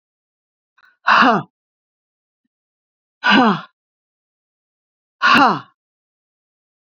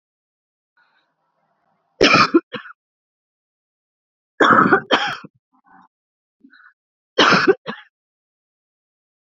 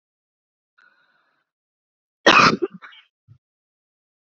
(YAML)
exhalation_length: 6.9 s
exhalation_amplitude: 28958
exhalation_signal_mean_std_ratio: 0.31
three_cough_length: 9.2 s
three_cough_amplitude: 32767
three_cough_signal_mean_std_ratio: 0.3
cough_length: 4.3 s
cough_amplitude: 29388
cough_signal_mean_std_ratio: 0.22
survey_phase: beta (2021-08-13 to 2022-03-07)
age: 45-64
gender: Female
wearing_mask: 'No'
symptom_cough_any: true
symptom_runny_or_blocked_nose: true
symptom_fatigue: true
symptom_headache: true
smoker_status: Current smoker (11 or more cigarettes per day)
respiratory_condition_asthma: false
respiratory_condition_other: false
recruitment_source: REACT
submission_delay: 3 days
covid_test_result: Negative
covid_test_method: RT-qPCR
influenza_a_test_result: Negative
influenza_b_test_result: Negative